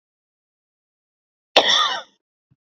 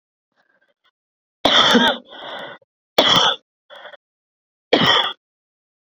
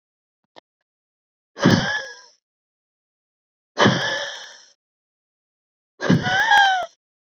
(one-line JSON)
{"cough_length": "2.7 s", "cough_amplitude": 32768, "cough_signal_mean_std_ratio": 0.29, "three_cough_length": "5.9 s", "three_cough_amplitude": 28972, "three_cough_signal_mean_std_ratio": 0.39, "exhalation_length": "7.3 s", "exhalation_amplitude": 26215, "exhalation_signal_mean_std_ratio": 0.38, "survey_phase": "beta (2021-08-13 to 2022-03-07)", "age": "18-44", "gender": "Female", "wearing_mask": "No", "symptom_runny_or_blocked_nose": true, "symptom_sore_throat": true, "symptom_abdominal_pain": true, "symptom_fatigue": true, "symptom_headache": true, "symptom_change_to_sense_of_smell_or_taste": true, "smoker_status": "Never smoked", "respiratory_condition_asthma": false, "respiratory_condition_other": false, "recruitment_source": "Test and Trace", "submission_delay": "2 days", "covid_test_result": "Positive", "covid_test_method": "RT-qPCR"}